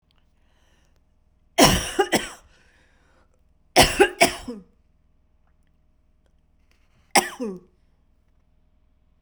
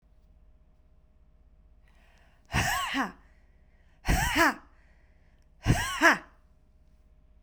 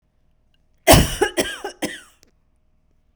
{
  "three_cough_length": "9.2 s",
  "three_cough_amplitude": 32767,
  "three_cough_signal_mean_std_ratio": 0.26,
  "exhalation_length": "7.4 s",
  "exhalation_amplitude": 17218,
  "exhalation_signal_mean_std_ratio": 0.36,
  "cough_length": "3.2 s",
  "cough_amplitude": 32768,
  "cough_signal_mean_std_ratio": 0.3,
  "survey_phase": "beta (2021-08-13 to 2022-03-07)",
  "age": "18-44",
  "gender": "Female",
  "wearing_mask": "No",
  "symptom_cough_any": true,
  "symptom_runny_or_blocked_nose": true,
  "symptom_headache": true,
  "smoker_status": "Never smoked",
  "respiratory_condition_asthma": false,
  "respiratory_condition_other": false,
  "recruitment_source": "Test and Trace",
  "submission_delay": "1 day",
  "covid_test_result": "Positive",
  "covid_test_method": "ePCR"
}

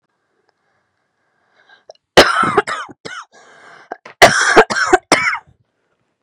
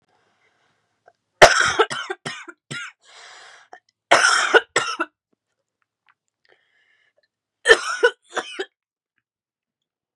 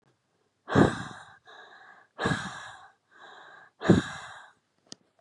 {
  "cough_length": "6.2 s",
  "cough_amplitude": 32768,
  "cough_signal_mean_std_ratio": 0.36,
  "three_cough_length": "10.2 s",
  "three_cough_amplitude": 32768,
  "three_cough_signal_mean_std_ratio": 0.28,
  "exhalation_length": "5.2 s",
  "exhalation_amplitude": 20547,
  "exhalation_signal_mean_std_ratio": 0.31,
  "survey_phase": "beta (2021-08-13 to 2022-03-07)",
  "age": "18-44",
  "gender": "Female",
  "wearing_mask": "No",
  "symptom_cough_any": true,
  "symptom_new_continuous_cough": true,
  "symptom_runny_or_blocked_nose": true,
  "symptom_shortness_of_breath": true,
  "symptom_sore_throat": true,
  "symptom_fatigue": true,
  "symptom_headache": true,
  "symptom_other": true,
  "smoker_status": "Current smoker (1 to 10 cigarettes per day)",
  "respiratory_condition_asthma": false,
  "respiratory_condition_other": false,
  "recruitment_source": "Test and Trace",
  "submission_delay": "1 day",
  "covid_test_result": "Positive",
  "covid_test_method": "RT-qPCR",
  "covid_ct_value": 32.9,
  "covid_ct_gene": "ORF1ab gene",
  "covid_ct_mean": 33.5,
  "covid_viral_load": "11 copies/ml",
  "covid_viral_load_category": "Minimal viral load (< 10K copies/ml)"
}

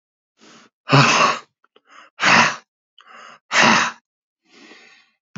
{
  "exhalation_length": "5.4 s",
  "exhalation_amplitude": 28989,
  "exhalation_signal_mean_std_ratio": 0.39,
  "survey_phase": "beta (2021-08-13 to 2022-03-07)",
  "age": "45-64",
  "gender": "Male",
  "wearing_mask": "No",
  "symptom_none": true,
  "smoker_status": "Current smoker (11 or more cigarettes per day)",
  "respiratory_condition_asthma": false,
  "respiratory_condition_other": false,
  "recruitment_source": "REACT",
  "submission_delay": "1 day",
  "covid_test_result": "Negative",
  "covid_test_method": "RT-qPCR",
  "influenza_a_test_result": "Negative",
  "influenza_b_test_result": "Negative"
}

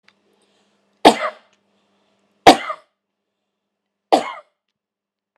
{
  "three_cough_length": "5.4 s",
  "three_cough_amplitude": 32768,
  "three_cough_signal_mean_std_ratio": 0.2,
  "survey_phase": "beta (2021-08-13 to 2022-03-07)",
  "age": "45-64",
  "gender": "Female",
  "wearing_mask": "No",
  "symptom_none": true,
  "smoker_status": "Ex-smoker",
  "respiratory_condition_asthma": false,
  "respiratory_condition_other": true,
  "recruitment_source": "REACT",
  "submission_delay": "2 days",
  "covid_test_result": "Negative",
  "covid_test_method": "RT-qPCR"
}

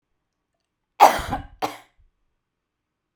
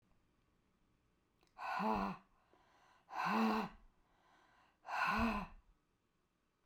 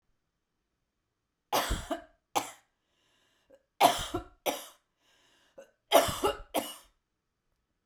{
  "cough_length": "3.2 s",
  "cough_amplitude": 32768,
  "cough_signal_mean_std_ratio": 0.22,
  "exhalation_length": "6.7 s",
  "exhalation_amplitude": 2032,
  "exhalation_signal_mean_std_ratio": 0.44,
  "three_cough_length": "7.9 s",
  "three_cough_amplitude": 14100,
  "three_cough_signal_mean_std_ratio": 0.3,
  "survey_phase": "beta (2021-08-13 to 2022-03-07)",
  "age": "45-64",
  "gender": "Female",
  "wearing_mask": "No",
  "symptom_none": true,
  "smoker_status": "Ex-smoker",
  "respiratory_condition_asthma": false,
  "respiratory_condition_other": false,
  "recruitment_source": "REACT",
  "submission_delay": "0 days",
  "covid_test_result": "Negative",
  "covid_test_method": "RT-qPCR",
  "influenza_a_test_result": "Negative",
  "influenza_b_test_result": "Negative"
}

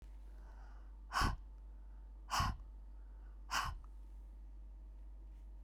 {
  "exhalation_length": "5.6 s",
  "exhalation_amplitude": 2458,
  "exhalation_signal_mean_std_ratio": 0.7,
  "survey_phase": "beta (2021-08-13 to 2022-03-07)",
  "age": "45-64",
  "gender": "Female",
  "wearing_mask": "No",
  "symptom_cough_any": true,
  "symptom_runny_or_blocked_nose": true,
  "symptom_fatigue": true,
  "symptom_fever_high_temperature": true,
  "symptom_headache": true,
  "symptom_change_to_sense_of_smell_or_taste": true,
  "symptom_other": true,
  "symptom_onset": "2 days",
  "smoker_status": "Ex-smoker",
  "respiratory_condition_asthma": false,
  "respiratory_condition_other": false,
  "recruitment_source": "Test and Trace",
  "submission_delay": "1 day",
  "covid_test_result": "Positive",
  "covid_test_method": "RT-qPCR",
  "covid_ct_value": 12.0,
  "covid_ct_gene": "ORF1ab gene",
  "covid_ct_mean": 12.5,
  "covid_viral_load": "82000000 copies/ml",
  "covid_viral_load_category": "High viral load (>1M copies/ml)"
}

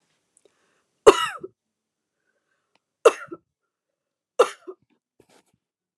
{
  "three_cough_length": "6.0 s",
  "three_cough_amplitude": 29204,
  "three_cough_signal_mean_std_ratio": 0.16,
  "survey_phase": "beta (2021-08-13 to 2022-03-07)",
  "age": "18-44",
  "gender": "Female",
  "wearing_mask": "Yes",
  "symptom_abdominal_pain": true,
  "symptom_fatigue": true,
  "symptom_headache": true,
  "smoker_status": "Never smoked",
  "respiratory_condition_asthma": true,
  "respiratory_condition_other": false,
  "recruitment_source": "REACT",
  "submission_delay": "4 days",
  "covid_test_result": "Negative",
  "covid_test_method": "RT-qPCR",
  "influenza_a_test_result": "Negative",
  "influenza_b_test_result": "Negative"
}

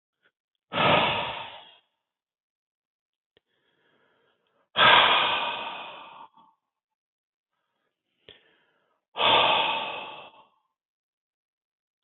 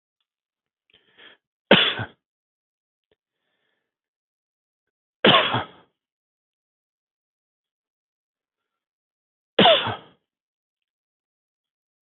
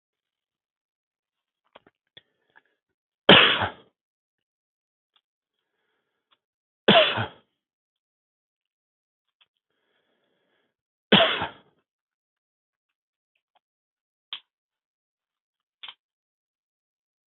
{
  "exhalation_length": "12.0 s",
  "exhalation_amplitude": 19112,
  "exhalation_signal_mean_std_ratio": 0.34,
  "cough_length": "12.0 s",
  "cough_amplitude": 32767,
  "cough_signal_mean_std_ratio": 0.21,
  "three_cough_length": "17.3 s",
  "three_cough_amplitude": 32768,
  "three_cough_signal_mean_std_ratio": 0.17,
  "survey_phase": "beta (2021-08-13 to 2022-03-07)",
  "age": "65+",
  "gender": "Male",
  "wearing_mask": "No",
  "symptom_cough_any": true,
  "symptom_runny_or_blocked_nose": true,
  "symptom_fatigue": true,
  "smoker_status": "Ex-smoker",
  "respiratory_condition_asthma": false,
  "respiratory_condition_other": false,
  "recruitment_source": "Test and Trace",
  "submission_delay": "3 days",
  "covid_test_result": "Negative",
  "covid_test_method": "LFT"
}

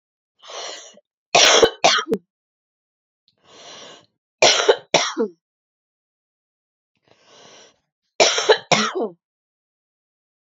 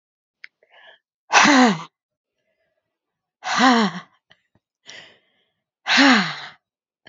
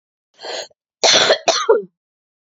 {
  "three_cough_length": "10.4 s",
  "three_cough_amplitude": 32767,
  "three_cough_signal_mean_std_ratio": 0.33,
  "exhalation_length": "7.1 s",
  "exhalation_amplitude": 32767,
  "exhalation_signal_mean_std_ratio": 0.36,
  "cough_length": "2.6 s",
  "cough_amplitude": 31845,
  "cough_signal_mean_std_ratio": 0.43,
  "survey_phase": "beta (2021-08-13 to 2022-03-07)",
  "age": "18-44",
  "gender": "Female",
  "wearing_mask": "No",
  "symptom_cough_any": true,
  "symptom_headache": true,
  "symptom_onset": "3 days",
  "smoker_status": "Ex-smoker",
  "respiratory_condition_asthma": false,
  "respiratory_condition_other": false,
  "recruitment_source": "REACT",
  "submission_delay": "1 day",
  "covid_test_result": "Negative",
  "covid_test_method": "RT-qPCR",
  "influenza_a_test_result": "Unknown/Void",
  "influenza_b_test_result": "Unknown/Void"
}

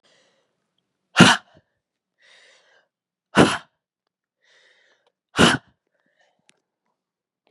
{
  "exhalation_length": "7.5 s",
  "exhalation_amplitude": 32768,
  "exhalation_signal_mean_std_ratio": 0.21,
  "survey_phase": "beta (2021-08-13 to 2022-03-07)",
  "age": "18-44",
  "gender": "Female",
  "wearing_mask": "No",
  "symptom_cough_any": true,
  "symptom_new_continuous_cough": true,
  "symptom_runny_or_blocked_nose": true,
  "symptom_fatigue": true,
  "symptom_headache": true,
  "symptom_onset": "2 days",
  "smoker_status": "Never smoked",
  "respiratory_condition_asthma": true,
  "respiratory_condition_other": false,
  "recruitment_source": "Test and Trace",
  "submission_delay": "1 day",
  "covid_test_result": "Positive",
  "covid_test_method": "RT-qPCR",
  "covid_ct_value": 26.8,
  "covid_ct_gene": "N gene"
}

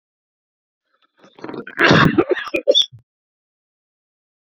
{
  "cough_length": "4.5 s",
  "cough_amplitude": 29119,
  "cough_signal_mean_std_ratio": 0.34,
  "survey_phase": "beta (2021-08-13 to 2022-03-07)",
  "age": "45-64",
  "gender": "Male",
  "wearing_mask": "No",
  "symptom_headache": true,
  "smoker_status": "Never smoked",
  "respiratory_condition_asthma": false,
  "respiratory_condition_other": false,
  "recruitment_source": "REACT",
  "submission_delay": "2 days",
  "covid_test_result": "Negative",
  "covid_test_method": "RT-qPCR"
}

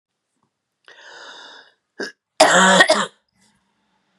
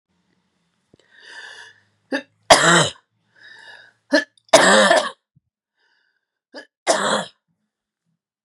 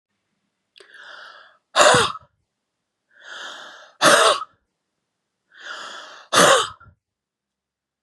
{
  "cough_length": "4.2 s",
  "cough_amplitude": 32768,
  "cough_signal_mean_std_ratio": 0.33,
  "three_cough_length": "8.4 s",
  "three_cough_amplitude": 32768,
  "three_cough_signal_mean_std_ratio": 0.32,
  "exhalation_length": "8.0 s",
  "exhalation_amplitude": 31226,
  "exhalation_signal_mean_std_ratio": 0.32,
  "survey_phase": "beta (2021-08-13 to 2022-03-07)",
  "age": "45-64",
  "gender": "Female",
  "wearing_mask": "No",
  "symptom_runny_or_blocked_nose": true,
  "symptom_fatigue": true,
  "symptom_other": true,
  "smoker_status": "Never smoked",
  "respiratory_condition_asthma": false,
  "respiratory_condition_other": false,
  "recruitment_source": "Test and Trace",
  "submission_delay": "4 days"
}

